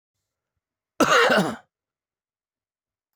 {"cough_length": "3.2 s", "cough_amplitude": 14921, "cough_signal_mean_std_ratio": 0.32, "survey_phase": "alpha (2021-03-01 to 2021-08-12)", "age": "65+", "gender": "Male", "wearing_mask": "No", "symptom_cough_any": true, "symptom_fatigue": true, "symptom_change_to_sense_of_smell_or_taste": true, "symptom_onset": "2 days", "smoker_status": "Ex-smoker", "respiratory_condition_asthma": false, "respiratory_condition_other": false, "recruitment_source": "Test and Trace", "submission_delay": "2 days", "covid_test_result": "Positive", "covid_test_method": "RT-qPCR"}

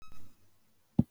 {"exhalation_length": "1.1 s", "exhalation_amplitude": 9698, "exhalation_signal_mean_std_ratio": 0.33, "survey_phase": "beta (2021-08-13 to 2022-03-07)", "age": "65+", "gender": "Female", "wearing_mask": "No", "symptom_none": true, "smoker_status": "Never smoked", "respiratory_condition_asthma": false, "respiratory_condition_other": false, "recruitment_source": "REACT", "submission_delay": "1 day", "covid_test_result": "Negative", "covid_test_method": "RT-qPCR", "influenza_a_test_result": "Negative", "influenza_b_test_result": "Negative"}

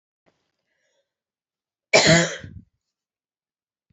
{"cough_length": "3.9 s", "cough_amplitude": 28009, "cough_signal_mean_std_ratio": 0.25, "survey_phase": "beta (2021-08-13 to 2022-03-07)", "age": "18-44", "gender": "Female", "wearing_mask": "No", "symptom_cough_any": true, "symptom_runny_or_blocked_nose": true, "symptom_shortness_of_breath": true, "symptom_headache": true, "symptom_change_to_sense_of_smell_or_taste": true, "symptom_loss_of_taste": true, "symptom_other": true, "smoker_status": "Never smoked", "respiratory_condition_asthma": false, "respiratory_condition_other": false, "recruitment_source": "Test and Trace", "submission_delay": "1 day", "covid_test_result": "Positive", "covid_test_method": "ePCR"}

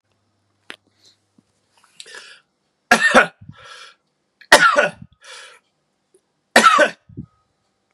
{"three_cough_length": "7.9 s", "three_cough_amplitude": 32768, "three_cough_signal_mean_std_ratio": 0.29, "survey_phase": "beta (2021-08-13 to 2022-03-07)", "age": "18-44", "gender": "Male", "wearing_mask": "No", "symptom_shortness_of_breath": true, "symptom_fatigue": true, "smoker_status": "Ex-smoker", "respiratory_condition_asthma": false, "respiratory_condition_other": false, "recruitment_source": "REACT", "submission_delay": "1 day", "covid_test_result": "Negative", "covid_test_method": "RT-qPCR", "influenza_a_test_result": "Negative", "influenza_b_test_result": "Negative"}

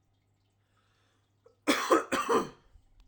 {"cough_length": "3.1 s", "cough_amplitude": 11285, "cough_signal_mean_std_ratio": 0.37, "survey_phase": "alpha (2021-03-01 to 2021-08-12)", "age": "18-44", "gender": "Male", "wearing_mask": "No", "symptom_none": true, "smoker_status": "Never smoked", "respiratory_condition_asthma": false, "respiratory_condition_other": false, "recruitment_source": "REACT", "submission_delay": "1 day", "covid_test_result": "Negative", "covid_test_method": "RT-qPCR"}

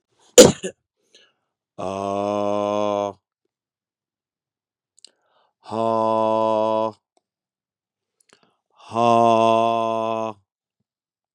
{"exhalation_length": "11.3 s", "exhalation_amplitude": 32768, "exhalation_signal_mean_std_ratio": 0.37, "survey_phase": "beta (2021-08-13 to 2022-03-07)", "age": "45-64", "gender": "Male", "wearing_mask": "No", "symptom_cough_any": true, "symptom_new_continuous_cough": true, "symptom_shortness_of_breath": true, "symptom_sore_throat": true, "symptom_onset": "3 days", "smoker_status": "Never smoked", "respiratory_condition_asthma": false, "respiratory_condition_other": false, "recruitment_source": "Test and Trace", "submission_delay": "2 days", "covid_test_result": "Positive", "covid_test_method": "RT-qPCR", "covid_ct_value": 22.4, "covid_ct_gene": "ORF1ab gene"}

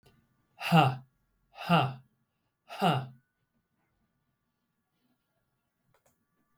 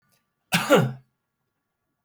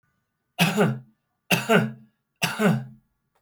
{"exhalation_length": "6.6 s", "exhalation_amplitude": 13745, "exhalation_signal_mean_std_ratio": 0.27, "cough_length": "2.0 s", "cough_amplitude": 17896, "cough_signal_mean_std_ratio": 0.32, "three_cough_length": "3.4 s", "three_cough_amplitude": 18990, "three_cough_signal_mean_std_ratio": 0.46, "survey_phase": "beta (2021-08-13 to 2022-03-07)", "age": "45-64", "gender": "Male", "wearing_mask": "No", "symptom_change_to_sense_of_smell_or_taste": true, "smoker_status": "Never smoked", "respiratory_condition_asthma": true, "respiratory_condition_other": false, "recruitment_source": "REACT", "submission_delay": "1 day", "covid_test_result": "Negative", "covid_test_method": "RT-qPCR", "influenza_a_test_result": "Unknown/Void", "influenza_b_test_result": "Unknown/Void"}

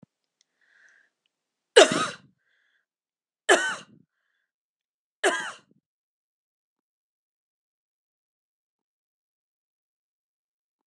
{"three_cough_length": "10.9 s", "three_cough_amplitude": 31286, "three_cough_signal_mean_std_ratio": 0.17, "survey_phase": "beta (2021-08-13 to 2022-03-07)", "age": "45-64", "gender": "Female", "wearing_mask": "No", "symptom_runny_or_blocked_nose": true, "symptom_sore_throat": true, "smoker_status": "Ex-smoker", "respiratory_condition_asthma": false, "respiratory_condition_other": false, "recruitment_source": "Test and Trace", "submission_delay": "0 days", "covid_test_result": "Positive", "covid_test_method": "LFT"}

